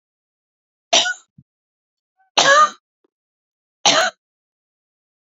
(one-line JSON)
{"three_cough_length": "5.4 s", "three_cough_amplitude": 32062, "three_cough_signal_mean_std_ratio": 0.3, "survey_phase": "beta (2021-08-13 to 2022-03-07)", "age": "45-64", "gender": "Female", "wearing_mask": "No", "symptom_none": true, "smoker_status": "Never smoked", "respiratory_condition_asthma": false, "respiratory_condition_other": false, "recruitment_source": "REACT", "submission_delay": "1 day", "covid_test_result": "Negative", "covid_test_method": "RT-qPCR"}